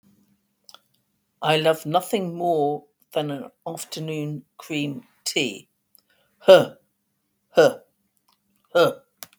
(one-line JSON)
{"exhalation_length": "9.4 s", "exhalation_amplitude": 32766, "exhalation_signal_mean_std_ratio": 0.37, "survey_phase": "beta (2021-08-13 to 2022-03-07)", "age": "65+", "gender": "Female", "wearing_mask": "No", "symptom_cough_any": true, "symptom_runny_or_blocked_nose": true, "smoker_status": "Never smoked", "respiratory_condition_asthma": false, "respiratory_condition_other": false, "recruitment_source": "REACT", "submission_delay": "1 day", "covid_test_result": "Negative", "covid_test_method": "RT-qPCR", "influenza_a_test_result": "Negative", "influenza_b_test_result": "Negative"}